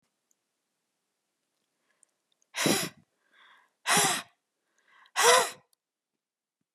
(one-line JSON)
{"exhalation_length": "6.7 s", "exhalation_amplitude": 14079, "exhalation_signal_mean_std_ratio": 0.29, "survey_phase": "beta (2021-08-13 to 2022-03-07)", "age": "65+", "gender": "Female", "wearing_mask": "No", "symptom_none": true, "smoker_status": "Ex-smoker", "respiratory_condition_asthma": false, "respiratory_condition_other": false, "recruitment_source": "REACT", "submission_delay": "1 day", "covid_test_result": "Negative", "covid_test_method": "RT-qPCR"}